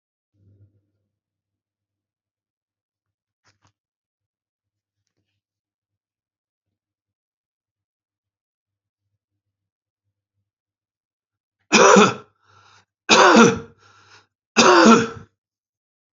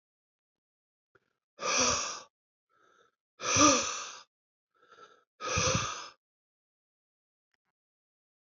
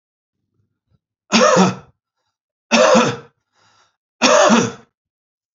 {"cough_length": "16.1 s", "cough_amplitude": 31830, "cough_signal_mean_std_ratio": 0.23, "exhalation_length": "8.5 s", "exhalation_amplitude": 11927, "exhalation_signal_mean_std_ratio": 0.33, "three_cough_length": "5.5 s", "three_cough_amplitude": 32768, "three_cough_signal_mean_std_ratio": 0.41, "survey_phase": "alpha (2021-03-01 to 2021-08-12)", "age": "65+", "gender": "Male", "wearing_mask": "No", "symptom_abdominal_pain": true, "symptom_fatigue": true, "symptom_change_to_sense_of_smell_or_taste": true, "symptom_loss_of_taste": true, "smoker_status": "Never smoked", "respiratory_condition_asthma": false, "respiratory_condition_other": false, "recruitment_source": "Test and Trace", "submission_delay": "3 days", "covid_test_result": "Positive", "covid_test_method": "RT-qPCR"}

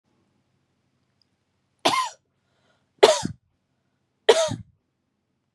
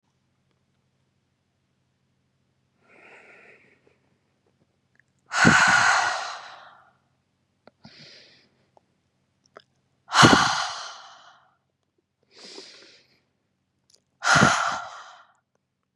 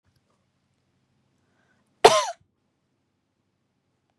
{"three_cough_length": "5.5 s", "three_cough_amplitude": 32712, "three_cough_signal_mean_std_ratio": 0.24, "exhalation_length": "16.0 s", "exhalation_amplitude": 30617, "exhalation_signal_mean_std_ratio": 0.29, "cough_length": "4.2 s", "cough_amplitude": 32767, "cough_signal_mean_std_ratio": 0.15, "survey_phase": "beta (2021-08-13 to 2022-03-07)", "age": "18-44", "gender": "Female", "wearing_mask": "No", "symptom_other": true, "smoker_status": "Never smoked", "respiratory_condition_asthma": false, "respiratory_condition_other": false, "recruitment_source": "REACT", "submission_delay": "1 day", "covid_test_result": "Negative", "covid_test_method": "RT-qPCR", "influenza_a_test_result": "Negative", "influenza_b_test_result": "Negative"}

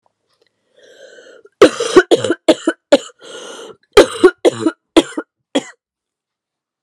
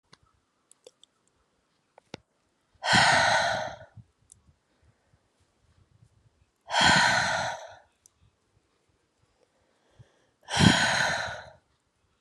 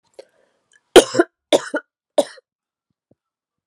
{"cough_length": "6.8 s", "cough_amplitude": 32768, "cough_signal_mean_std_ratio": 0.32, "exhalation_length": "12.2 s", "exhalation_amplitude": 23237, "exhalation_signal_mean_std_ratio": 0.36, "three_cough_length": "3.7 s", "three_cough_amplitude": 32768, "three_cough_signal_mean_std_ratio": 0.21, "survey_phase": "alpha (2021-03-01 to 2021-08-12)", "age": "18-44", "gender": "Female", "wearing_mask": "No", "symptom_cough_any": true, "symptom_diarrhoea": true, "symptom_fatigue": true, "symptom_change_to_sense_of_smell_or_taste": true, "symptom_onset": "4 days", "smoker_status": "Never smoked", "respiratory_condition_asthma": false, "respiratory_condition_other": false, "recruitment_source": "Test and Trace", "submission_delay": "2 days", "covid_test_result": "Positive", "covid_test_method": "RT-qPCR"}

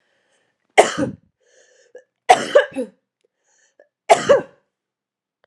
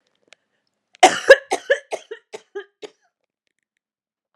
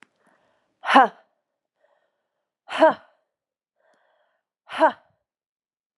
{"three_cough_length": "5.5 s", "three_cough_amplitude": 32768, "three_cough_signal_mean_std_ratio": 0.28, "cough_length": "4.4 s", "cough_amplitude": 32768, "cough_signal_mean_std_ratio": 0.21, "exhalation_length": "6.0 s", "exhalation_amplitude": 30477, "exhalation_signal_mean_std_ratio": 0.22, "survey_phase": "alpha (2021-03-01 to 2021-08-12)", "age": "18-44", "gender": "Female", "wearing_mask": "No", "symptom_cough_any": true, "symptom_new_continuous_cough": true, "symptom_fatigue": true, "symptom_headache": true, "smoker_status": "Never smoked", "respiratory_condition_asthma": false, "respiratory_condition_other": false, "recruitment_source": "Test and Trace", "submission_delay": "2 days", "covid_test_result": "Positive", "covid_test_method": "RT-qPCR", "covid_ct_value": 16.1, "covid_ct_gene": "N gene", "covid_ct_mean": 16.2, "covid_viral_load": "4900000 copies/ml", "covid_viral_load_category": "High viral load (>1M copies/ml)"}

